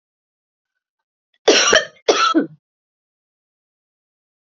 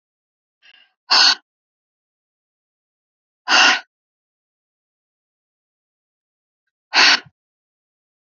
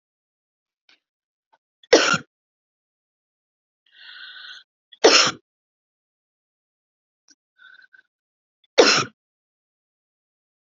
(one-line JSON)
{"cough_length": "4.5 s", "cough_amplitude": 30174, "cough_signal_mean_std_ratio": 0.31, "exhalation_length": "8.4 s", "exhalation_amplitude": 32768, "exhalation_signal_mean_std_ratio": 0.24, "three_cough_length": "10.7 s", "three_cough_amplitude": 32767, "three_cough_signal_mean_std_ratio": 0.21, "survey_phase": "alpha (2021-03-01 to 2021-08-12)", "age": "45-64", "gender": "Female", "wearing_mask": "No", "symptom_none": true, "smoker_status": "Never smoked", "respiratory_condition_asthma": false, "respiratory_condition_other": false, "recruitment_source": "Test and Trace", "submission_delay": "2 days", "covid_test_result": "Positive", "covid_test_method": "RT-qPCR", "covid_ct_value": 40.1, "covid_ct_gene": "ORF1ab gene"}